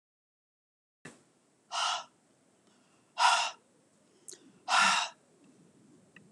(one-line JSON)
{"exhalation_length": "6.3 s", "exhalation_amplitude": 8920, "exhalation_signal_mean_std_ratio": 0.33, "survey_phase": "beta (2021-08-13 to 2022-03-07)", "age": "65+", "gender": "Female", "wearing_mask": "No", "symptom_none": true, "smoker_status": "Never smoked", "respiratory_condition_asthma": false, "respiratory_condition_other": false, "recruitment_source": "REACT", "submission_delay": "2 days", "covid_test_result": "Negative", "covid_test_method": "RT-qPCR"}